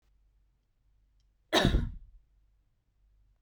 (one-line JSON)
{"cough_length": "3.4 s", "cough_amplitude": 10093, "cough_signal_mean_std_ratio": 0.27, "survey_phase": "beta (2021-08-13 to 2022-03-07)", "age": "18-44", "gender": "Female", "wearing_mask": "Yes", "symptom_sore_throat": true, "smoker_status": "Current smoker (1 to 10 cigarettes per day)", "respiratory_condition_asthma": false, "respiratory_condition_other": false, "recruitment_source": "REACT", "submission_delay": "0 days", "covid_test_result": "Negative", "covid_test_method": "RT-qPCR", "influenza_a_test_result": "Negative", "influenza_b_test_result": "Negative"}